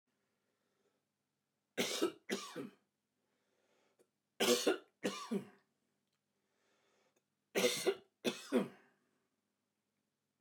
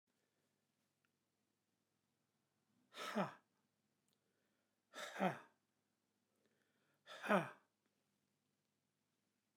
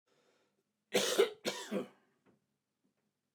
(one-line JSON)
{"three_cough_length": "10.4 s", "three_cough_amplitude": 4038, "three_cough_signal_mean_std_ratio": 0.32, "exhalation_length": "9.6 s", "exhalation_amplitude": 2273, "exhalation_signal_mean_std_ratio": 0.22, "cough_length": "3.3 s", "cough_amplitude": 5297, "cough_signal_mean_std_ratio": 0.32, "survey_phase": "beta (2021-08-13 to 2022-03-07)", "age": "45-64", "gender": "Male", "wearing_mask": "No", "symptom_new_continuous_cough": true, "symptom_runny_or_blocked_nose": true, "symptom_shortness_of_breath": true, "symptom_sore_throat": true, "symptom_fatigue": true, "symptom_fever_high_temperature": true, "symptom_other": true, "symptom_onset": "8 days", "smoker_status": "Never smoked", "respiratory_condition_asthma": true, "respiratory_condition_other": false, "recruitment_source": "REACT", "submission_delay": "0 days", "covid_test_result": "Positive", "covid_test_method": "RT-qPCR", "covid_ct_value": 19.0, "covid_ct_gene": "E gene", "influenza_a_test_result": "Negative", "influenza_b_test_result": "Negative"}